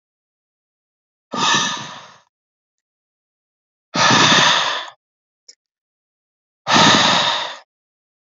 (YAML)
exhalation_length: 8.4 s
exhalation_amplitude: 30154
exhalation_signal_mean_std_ratio: 0.41
survey_phase: beta (2021-08-13 to 2022-03-07)
age: 45-64
gender: Male
wearing_mask: 'Yes'
symptom_cough_any: true
symptom_runny_or_blocked_nose: true
symptom_shortness_of_breath: true
symptom_sore_throat: true
symptom_headache: true
symptom_change_to_sense_of_smell_or_taste: true
symptom_other: true
symptom_onset: 2 days
smoker_status: Never smoked
respiratory_condition_asthma: false
respiratory_condition_other: false
recruitment_source: Test and Trace
submission_delay: 2 days
covid_test_result: Positive
covid_test_method: RT-qPCR
covid_ct_value: 17.3
covid_ct_gene: N gene